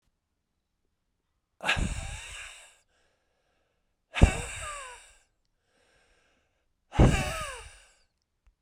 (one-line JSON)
{"exhalation_length": "8.6 s", "exhalation_amplitude": 27907, "exhalation_signal_mean_std_ratio": 0.26, "survey_phase": "beta (2021-08-13 to 2022-03-07)", "age": "45-64", "gender": "Male", "wearing_mask": "No", "symptom_cough_any": true, "symptom_new_continuous_cough": true, "symptom_runny_or_blocked_nose": true, "symptom_fatigue": true, "smoker_status": "Ex-smoker", "respiratory_condition_asthma": false, "respiratory_condition_other": false, "recruitment_source": "Test and Trace", "submission_delay": "2 days", "covid_test_result": "Positive", "covid_test_method": "RT-qPCR"}